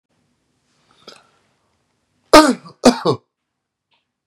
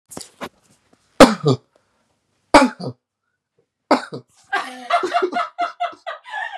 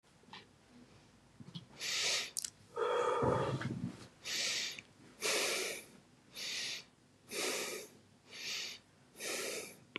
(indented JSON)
{
  "cough_length": "4.3 s",
  "cough_amplitude": 32768,
  "cough_signal_mean_std_ratio": 0.23,
  "three_cough_length": "6.6 s",
  "three_cough_amplitude": 32768,
  "three_cough_signal_mean_std_ratio": 0.33,
  "exhalation_length": "10.0 s",
  "exhalation_amplitude": 5666,
  "exhalation_signal_mean_std_ratio": 0.63,
  "survey_phase": "beta (2021-08-13 to 2022-03-07)",
  "age": "18-44",
  "gender": "Male",
  "wearing_mask": "No",
  "symptom_none": true,
  "smoker_status": "Never smoked",
  "respiratory_condition_asthma": false,
  "respiratory_condition_other": false,
  "recruitment_source": "REACT",
  "submission_delay": "2 days",
  "covid_test_result": "Negative",
  "covid_test_method": "RT-qPCR",
  "influenza_a_test_result": "Negative",
  "influenza_b_test_result": "Negative"
}